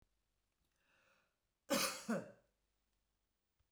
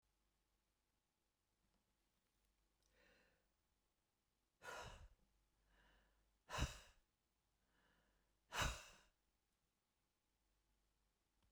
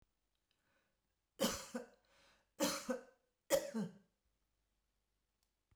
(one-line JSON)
{"cough_length": "3.7 s", "cough_amplitude": 2128, "cough_signal_mean_std_ratio": 0.28, "exhalation_length": "11.5 s", "exhalation_amplitude": 1160, "exhalation_signal_mean_std_ratio": 0.22, "three_cough_length": "5.8 s", "three_cough_amplitude": 3008, "three_cough_signal_mean_std_ratio": 0.32, "survey_phase": "beta (2021-08-13 to 2022-03-07)", "age": "65+", "gender": "Female", "wearing_mask": "No", "symptom_none": true, "smoker_status": "Never smoked", "respiratory_condition_asthma": false, "respiratory_condition_other": false, "recruitment_source": "REACT", "submission_delay": "1 day", "covid_test_result": "Negative", "covid_test_method": "RT-qPCR"}